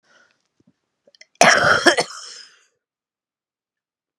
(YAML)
cough_length: 4.2 s
cough_amplitude: 32768
cough_signal_mean_std_ratio: 0.29
survey_phase: beta (2021-08-13 to 2022-03-07)
age: 45-64
gender: Female
wearing_mask: 'No'
symptom_cough_any: true
symptom_shortness_of_breath: true
symptom_fatigue: true
symptom_change_to_sense_of_smell_or_taste: true
symptom_other: true
smoker_status: Ex-smoker
respiratory_condition_asthma: false
respiratory_condition_other: false
recruitment_source: Test and Trace
submission_delay: 1 day
covid_test_result: Positive
covid_test_method: LFT